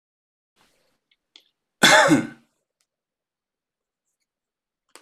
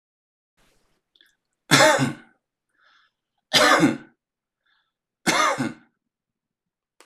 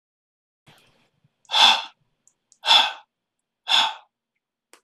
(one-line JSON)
{"cough_length": "5.0 s", "cough_amplitude": 25498, "cough_signal_mean_std_ratio": 0.23, "three_cough_length": "7.1 s", "three_cough_amplitude": 25267, "three_cough_signal_mean_std_ratio": 0.33, "exhalation_length": "4.8 s", "exhalation_amplitude": 25021, "exhalation_signal_mean_std_ratio": 0.31, "survey_phase": "beta (2021-08-13 to 2022-03-07)", "age": "45-64", "gender": "Male", "wearing_mask": "No", "symptom_none": true, "smoker_status": "Never smoked", "respiratory_condition_asthma": false, "respiratory_condition_other": false, "recruitment_source": "REACT", "submission_delay": "1 day", "covid_test_result": "Negative", "covid_test_method": "RT-qPCR"}